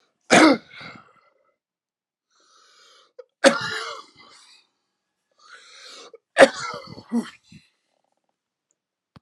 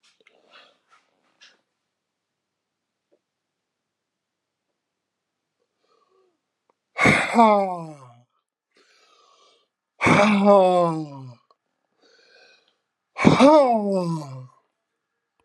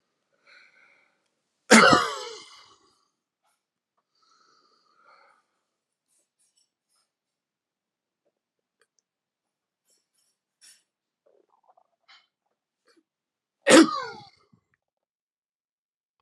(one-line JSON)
{"three_cough_length": "9.2 s", "three_cough_amplitude": 32767, "three_cough_signal_mean_std_ratio": 0.23, "exhalation_length": "15.4 s", "exhalation_amplitude": 32163, "exhalation_signal_mean_std_ratio": 0.33, "cough_length": "16.2 s", "cough_amplitude": 30187, "cough_signal_mean_std_ratio": 0.16, "survey_phase": "alpha (2021-03-01 to 2021-08-12)", "age": "65+", "gender": "Male", "wearing_mask": "No", "symptom_none": true, "smoker_status": "Never smoked", "respiratory_condition_asthma": false, "respiratory_condition_other": false, "recruitment_source": "REACT", "submission_delay": "2 days", "covid_test_result": "Negative", "covid_test_method": "RT-qPCR"}